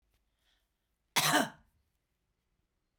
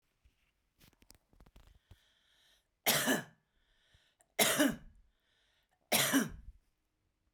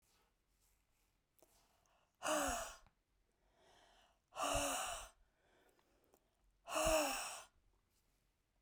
cough_length: 3.0 s
cough_amplitude: 9757
cough_signal_mean_std_ratio: 0.25
three_cough_length: 7.3 s
three_cough_amplitude: 8156
three_cough_signal_mean_std_ratio: 0.32
exhalation_length: 8.6 s
exhalation_amplitude: 2122
exhalation_signal_mean_std_ratio: 0.38
survey_phase: beta (2021-08-13 to 2022-03-07)
age: 45-64
gender: Female
wearing_mask: 'No'
symptom_cough_any: true
symptom_runny_or_blocked_nose: true
symptom_fatigue: true
symptom_change_to_sense_of_smell_or_taste: true
symptom_other: true
symptom_onset: 4 days
smoker_status: Never smoked
respiratory_condition_asthma: false
respiratory_condition_other: false
recruitment_source: Test and Trace
submission_delay: 1 day
covid_test_result: Positive
covid_test_method: RT-qPCR
covid_ct_value: 11.3
covid_ct_gene: ORF1ab gene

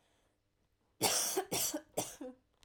three_cough_length: 2.6 s
three_cough_amplitude: 4595
three_cough_signal_mean_std_ratio: 0.49
survey_phase: alpha (2021-03-01 to 2021-08-12)
age: 18-44
gender: Female
wearing_mask: 'No'
symptom_none: true
symptom_onset: 12 days
smoker_status: Never smoked
respiratory_condition_asthma: true
respiratory_condition_other: false
recruitment_source: REACT
submission_delay: 1 day
covid_test_result: Negative
covid_test_method: RT-qPCR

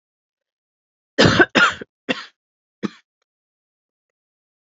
cough_length: 4.6 s
cough_amplitude: 30320
cough_signal_mean_std_ratio: 0.26
survey_phase: alpha (2021-03-01 to 2021-08-12)
age: 18-44
gender: Female
wearing_mask: 'No'
symptom_cough_any: true
symptom_fatigue: true
symptom_headache: true
symptom_onset: 3 days
smoker_status: Never smoked
respiratory_condition_asthma: false
respiratory_condition_other: false
recruitment_source: Test and Trace
submission_delay: 1 day
covid_test_result: Positive
covid_test_method: RT-qPCR
covid_ct_value: 20.3
covid_ct_gene: ORF1ab gene
covid_ct_mean: 20.5
covid_viral_load: 180000 copies/ml
covid_viral_load_category: Low viral load (10K-1M copies/ml)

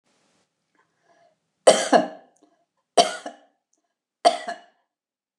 three_cough_length: 5.4 s
three_cough_amplitude: 28651
three_cough_signal_mean_std_ratio: 0.24
survey_phase: beta (2021-08-13 to 2022-03-07)
age: 65+
gender: Female
wearing_mask: 'No'
symptom_runny_or_blocked_nose: true
smoker_status: Never smoked
respiratory_condition_asthma: false
respiratory_condition_other: false
recruitment_source: Test and Trace
submission_delay: 1 day
covid_test_result: Negative
covid_test_method: LFT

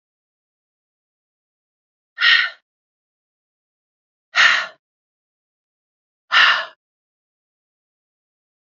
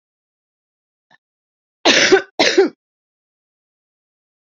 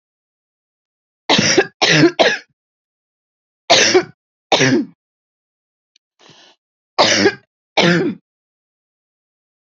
exhalation_length: 8.8 s
exhalation_amplitude: 29536
exhalation_signal_mean_std_ratio: 0.24
cough_length: 4.5 s
cough_amplitude: 32768
cough_signal_mean_std_ratio: 0.29
three_cough_length: 9.7 s
three_cough_amplitude: 32767
three_cough_signal_mean_std_ratio: 0.39
survey_phase: beta (2021-08-13 to 2022-03-07)
age: 18-44
gender: Female
wearing_mask: 'No'
symptom_none: true
smoker_status: Ex-smoker
respiratory_condition_asthma: false
respiratory_condition_other: false
recruitment_source: REACT
submission_delay: 1 day
covid_test_result: Negative
covid_test_method: RT-qPCR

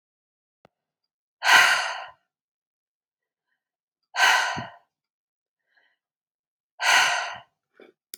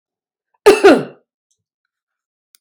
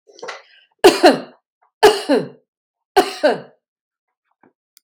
exhalation_length: 8.2 s
exhalation_amplitude: 25932
exhalation_signal_mean_std_ratio: 0.32
cough_length: 2.6 s
cough_amplitude: 32768
cough_signal_mean_std_ratio: 0.28
three_cough_length: 4.8 s
three_cough_amplitude: 32768
three_cough_signal_mean_std_ratio: 0.33
survey_phase: beta (2021-08-13 to 2022-03-07)
age: 45-64
gender: Female
wearing_mask: 'No'
symptom_none: true
smoker_status: Never smoked
respiratory_condition_asthma: false
respiratory_condition_other: false
recruitment_source: REACT
submission_delay: 2 days
covid_test_result: Negative
covid_test_method: RT-qPCR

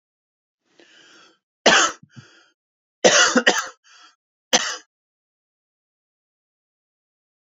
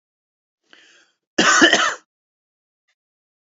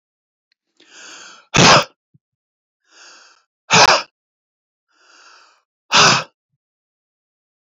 three_cough_length: 7.4 s
three_cough_amplitude: 32085
three_cough_signal_mean_std_ratio: 0.27
cough_length: 3.5 s
cough_amplitude: 28845
cough_signal_mean_std_ratio: 0.31
exhalation_length: 7.7 s
exhalation_amplitude: 32768
exhalation_signal_mean_std_ratio: 0.28
survey_phase: beta (2021-08-13 to 2022-03-07)
age: 45-64
gender: Male
wearing_mask: 'No'
symptom_none: true
smoker_status: Never smoked
respiratory_condition_asthma: false
respiratory_condition_other: false
recruitment_source: REACT
submission_delay: 2 days
covid_test_result: Negative
covid_test_method: RT-qPCR
influenza_a_test_result: Negative
influenza_b_test_result: Negative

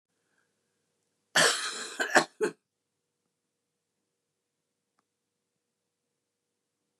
cough_length: 7.0 s
cough_amplitude: 20350
cough_signal_mean_std_ratio: 0.23
survey_phase: beta (2021-08-13 to 2022-03-07)
age: 65+
gender: Female
wearing_mask: 'No'
symptom_cough_any: true
symptom_headache: true
smoker_status: Never smoked
respiratory_condition_asthma: false
respiratory_condition_other: false
recruitment_source: REACT
submission_delay: 2 days
covid_test_result: Negative
covid_test_method: RT-qPCR
influenza_a_test_result: Negative
influenza_b_test_result: Negative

